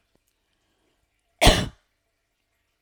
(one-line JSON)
{"cough_length": "2.8 s", "cough_amplitude": 29939, "cough_signal_mean_std_ratio": 0.21, "survey_phase": "alpha (2021-03-01 to 2021-08-12)", "age": "45-64", "gender": "Female", "wearing_mask": "No", "symptom_none": true, "smoker_status": "Never smoked", "respiratory_condition_asthma": false, "respiratory_condition_other": false, "recruitment_source": "REACT", "submission_delay": "1 day", "covid_test_result": "Negative", "covid_test_method": "RT-qPCR"}